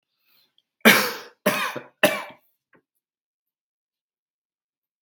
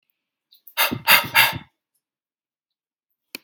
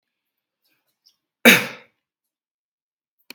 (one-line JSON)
{"three_cough_length": "5.0 s", "three_cough_amplitude": 32768, "three_cough_signal_mean_std_ratio": 0.26, "exhalation_length": "3.4 s", "exhalation_amplitude": 32768, "exhalation_signal_mean_std_ratio": 0.3, "cough_length": "3.3 s", "cough_amplitude": 32768, "cough_signal_mean_std_ratio": 0.17, "survey_phase": "beta (2021-08-13 to 2022-03-07)", "age": "18-44", "gender": "Male", "wearing_mask": "No", "symptom_cough_any": true, "symptom_runny_or_blocked_nose": true, "smoker_status": "Never smoked", "respiratory_condition_asthma": false, "respiratory_condition_other": false, "recruitment_source": "REACT", "submission_delay": "11 days", "covid_test_result": "Negative", "covid_test_method": "RT-qPCR"}